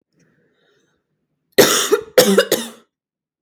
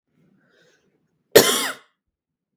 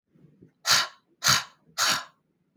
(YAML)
three_cough_length: 3.4 s
three_cough_amplitude: 32768
three_cough_signal_mean_std_ratio: 0.36
cough_length: 2.6 s
cough_amplitude: 32768
cough_signal_mean_std_ratio: 0.24
exhalation_length: 2.6 s
exhalation_amplitude: 16280
exhalation_signal_mean_std_ratio: 0.4
survey_phase: beta (2021-08-13 to 2022-03-07)
age: 18-44
gender: Female
wearing_mask: 'No'
symptom_fatigue: true
smoker_status: Never smoked
respiratory_condition_asthma: false
respiratory_condition_other: false
recruitment_source: REACT
submission_delay: 2 days
covid_test_result: Negative
covid_test_method: RT-qPCR
influenza_a_test_result: Negative
influenza_b_test_result: Negative